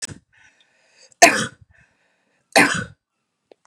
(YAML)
three_cough_length: 3.7 s
three_cough_amplitude: 32768
three_cough_signal_mean_std_ratio: 0.26
survey_phase: beta (2021-08-13 to 2022-03-07)
age: 18-44
gender: Female
wearing_mask: 'No'
symptom_none: true
smoker_status: Ex-smoker
respiratory_condition_asthma: false
respiratory_condition_other: false
recruitment_source: Test and Trace
submission_delay: 0 days
covid_test_result: Negative
covid_test_method: LFT